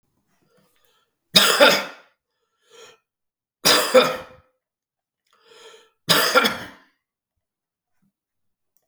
{
  "three_cough_length": "8.9 s",
  "three_cough_amplitude": 32767,
  "three_cough_signal_mean_std_ratio": 0.31,
  "survey_phase": "beta (2021-08-13 to 2022-03-07)",
  "age": "65+",
  "gender": "Male",
  "wearing_mask": "No",
  "symptom_none": true,
  "symptom_onset": "4 days",
  "smoker_status": "Never smoked",
  "respiratory_condition_asthma": false,
  "respiratory_condition_other": false,
  "recruitment_source": "REACT",
  "submission_delay": "1 day",
  "covid_test_result": "Negative",
  "covid_test_method": "RT-qPCR",
  "influenza_a_test_result": "Negative",
  "influenza_b_test_result": "Negative"
}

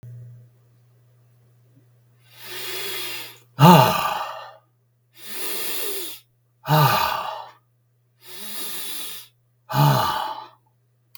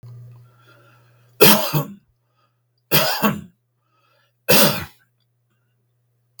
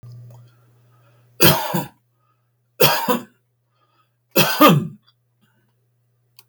{
  "exhalation_length": "11.2 s",
  "exhalation_amplitude": 32768,
  "exhalation_signal_mean_std_ratio": 0.41,
  "three_cough_length": "6.4 s",
  "three_cough_amplitude": 32768,
  "three_cough_signal_mean_std_ratio": 0.33,
  "cough_length": "6.5 s",
  "cough_amplitude": 32768,
  "cough_signal_mean_std_ratio": 0.34,
  "survey_phase": "beta (2021-08-13 to 2022-03-07)",
  "age": "65+",
  "gender": "Male",
  "wearing_mask": "No",
  "symptom_cough_any": true,
  "smoker_status": "Never smoked",
  "respiratory_condition_asthma": false,
  "respiratory_condition_other": false,
  "recruitment_source": "REACT",
  "submission_delay": "2 days",
  "covid_test_result": "Negative",
  "covid_test_method": "RT-qPCR",
  "influenza_a_test_result": "Negative",
  "influenza_b_test_result": "Negative"
}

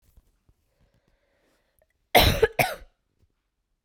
{
  "cough_length": "3.8 s",
  "cough_amplitude": 24606,
  "cough_signal_mean_std_ratio": 0.25,
  "survey_phase": "beta (2021-08-13 to 2022-03-07)",
  "age": "18-44",
  "gender": "Female",
  "wearing_mask": "No",
  "symptom_cough_any": true,
  "symptom_runny_or_blocked_nose": true,
  "symptom_sore_throat": true,
  "symptom_abdominal_pain": true,
  "symptom_diarrhoea": true,
  "symptom_fatigue": true,
  "symptom_fever_high_temperature": true,
  "symptom_headache": true,
  "symptom_onset": "4 days",
  "smoker_status": "Never smoked",
  "respiratory_condition_asthma": false,
  "respiratory_condition_other": false,
  "recruitment_source": "Test and Trace",
  "submission_delay": "3 days",
  "covid_test_result": "Positive",
  "covid_test_method": "ePCR"
}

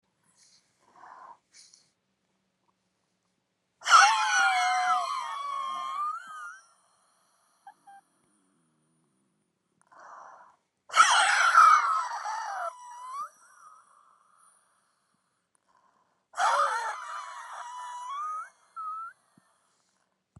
{
  "exhalation_length": "20.4 s",
  "exhalation_amplitude": 17550,
  "exhalation_signal_mean_std_ratio": 0.38,
  "survey_phase": "beta (2021-08-13 to 2022-03-07)",
  "age": "65+",
  "gender": "Female",
  "wearing_mask": "No",
  "symptom_shortness_of_breath": true,
  "smoker_status": "Ex-smoker",
  "respiratory_condition_asthma": true,
  "respiratory_condition_other": true,
  "recruitment_source": "REACT",
  "submission_delay": "1 day",
  "covid_test_result": "Negative",
  "covid_test_method": "RT-qPCR"
}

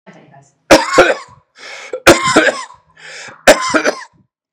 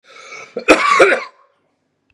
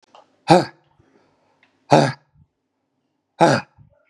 {
  "three_cough_length": "4.5 s",
  "three_cough_amplitude": 32768,
  "three_cough_signal_mean_std_ratio": 0.43,
  "cough_length": "2.1 s",
  "cough_amplitude": 32768,
  "cough_signal_mean_std_ratio": 0.43,
  "exhalation_length": "4.1 s",
  "exhalation_amplitude": 32768,
  "exhalation_signal_mean_std_ratio": 0.27,
  "survey_phase": "beta (2021-08-13 to 2022-03-07)",
  "age": "18-44",
  "gender": "Male",
  "wearing_mask": "No",
  "symptom_none": true,
  "symptom_onset": "6 days",
  "smoker_status": "Ex-smoker",
  "respiratory_condition_asthma": false,
  "respiratory_condition_other": false,
  "recruitment_source": "REACT",
  "submission_delay": "2 days",
  "covid_test_result": "Negative",
  "covid_test_method": "RT-qPCR",
  "influenza_a_test_result": "Negative",
  "influenza_b_test_result": "Negative"
}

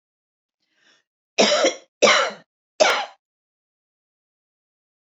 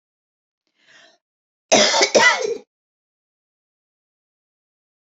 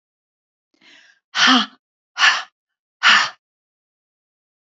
{
  "three_cough_length": "5.0 s",
  "three_cough_amplitude": 28278,
  "three_cough_signal_mean_std_ratio": 0.32,
  "cough_length": "5.0 s",
  "cough_amplitude": 31028,
  "cough_signal_mean_std_ratio": 0.3,
  "exhalation_length": "4.6 s",
  "exhalation_amplitude": 29086,
  "exhalation_signal_mean_std_ratio": 0.32,
  "survey_phase": "beta (2021-08-13 to 2022-03-07)",
  "age": "45-64",
  "gender": "Female",
  "wearing_mask": "No",
  "symptom_none": true,
  "smoker_status": "Ex-smoker",
  "respiratory_condition_asthma": false,
  "respiratory_condition_other": false,
  "recruitment_source": "Test and Trace",
  "submission_delay": "2 days",
  "covid_test_result": "Positive",
  "covid_test_method": "RT-qPCR",
  "covid_ct_value": 27.8,
  "covid_ct_gene": "N gene"
}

